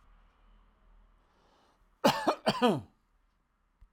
{"cough_length": "3.9 s", "cough_amplitude": 8474, "cough_signal_mean_std_ratio": 0.3, "survey_phase": "alpha (2021-03-01 to 2021-08-12)", "age": "65+", "gender": "Male", "wearing_mask": "No", "symptom_none": true, "smoker_status": "Ex-smoker", "respiratory_condition_asthma": false, "respiratory_condition_other": false, "recruitment_source": "REACT", "submission_delay": "1 day", "covid_test_result": "Negative", "covid_test_method": "RT-qPCR"}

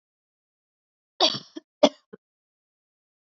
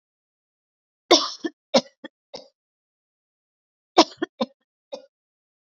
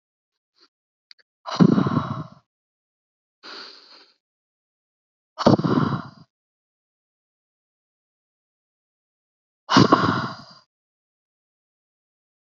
{"cough_length": "3.2 s", "cough_amplitude": 27233, "cough_signal_mean_std_ratio": 0.18, "three_cough_length": "5.7 s", "three_cough_amplitude": 31485, "three_cough_signal_mean_std_ratio": 0.19, "exhalation_length": "12.5 s", "exhalation_amplitude": 27389, "exhalation_signal_mean_std_ratio": 0.26, "survey_phase": "beta (2021-08-13 to 2022-03-07)", "age": "18-44", "gender": "Female", "wearing_mask": "No", "symptom_cough_any": true, "symptom_runny_or_blocked_nose": true, "symptom_sore_throat": true, "symptom_abdominal_pain": true, "symptom_headache": true, "symptom_onset": "5 days", "smoker_status": "Prefer not to say", "respiratory_condition_asthma": false, "respiratory_condition_other": false, "recruitment_source": "REACT", "submission_delay": "1 day", "covid_test_result": "Negative", "covid_test_method": "RT-qPCR", "influenza_a_test_result": "Negative", "influenza_b_test_result": "Negative"}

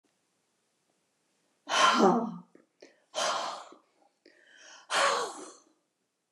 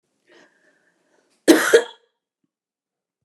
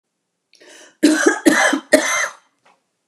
{"exhalation_length": "6.3 s", "exhalation_amplitude": 12566, "exhalation_signal_mean_std_ratio": 0.38, "cough_length": "3.2 s", "cough_amplitude": 29204, "cough_signal_mean_std_ratio": 0.23, "three_cough_length": "3.1 s", "three_cough_amplitude": 29204, "three_cough_signal_mean_std_ratio": 0.46, "survey_phase": "beta (2021-08-13 to 2022-03-07)", "age": "65+", "gender": "Female", "wearing_mask": "No", "symptom_none": true, "smoker_status": "Never smoked", "respiratory_condition_asthma": false, "respiratory_condition_other": false, "recruitment_source": "REACT", "submission_delay": "1 day", "covid_test_result": "Negative", "covid_test_method": "RT-qPCR"}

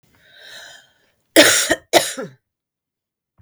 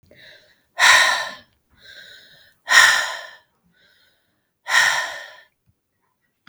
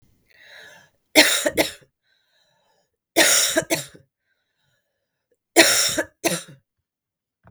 {"cough_length": "3.4 s", "cough_amplitude": 32768, "cough_signal_mean_std_ratio": 0.31, "exhalation_length": "6.5 s", "exhalation_amplitude": 32768, "exhalation_signal_mean_std_ratio": 0.36, "three_cough_length": "7.5 s", "three_cough_amplitude": 32768, "three_cough_signal_mean_std_ratio": 0.35, "survey_phase": "beta (2021-08-13 to 2022-03-07)", "age": "45-64", "gender": "Female", "wearing_mask": "No", "symptom_cough_any": true, "symptom_runny_or_blocked_nose": true, "symptom_shortness_of_breath": true, "symptom_sore_throat": true, "symptom_fatigue": true, "symptom_other": true, "symptom_onset": "3 days", "smoker_status": "Ex-smoker", "respiratory_condition_asthma": false, "respiratory_condition_other": false, "recruitment_source": "Test and Trace", "submission_delay": "2 days", "covid_test_result": "Positive", "covid_test_method": "ePCR"}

